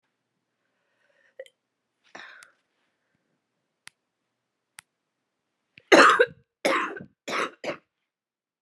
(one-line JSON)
{"three_cough_length": "8.6 s", "three_cough_amplitude": 27230, "three_cough_signal_mean_std_ratio": 0.22, "survey_phase": "beta (2021-08-13 to 2022-03-07)", "age": "18-44", "gender": "Female", "wearing_mask": "No", "symptom_cough_any": true, "symptom_runny_or_blocked_nose": true, "symptom_shortness_of_breath": true, "symptom_sore_throat": true, "symptom_fatigue": true, "symptom_fever_high_temperature": true, "symptom_headache": true, "symptom_change_to_sense_of_smell_or_taste": true, "symptom_onset": "5 days", "smoker_status": "Never smoked", "respiratory_condition_asthma": false, "respiratory_condition_other": false, "recruitment_source": "Test and Trace", "submission_delay": "3 days", "covid_test_result": "Positive", "covid_test_method": "RT-qPCR", "covid_ct_value": 26.0, "covid_ct_gene": "ORF1ab gene", "covid_ct_mean": 26.8, "covid_viral_load": "1700 copies/ml", "covid_viral_load_category": "Minimal viral load (< 10K copies/ml)"}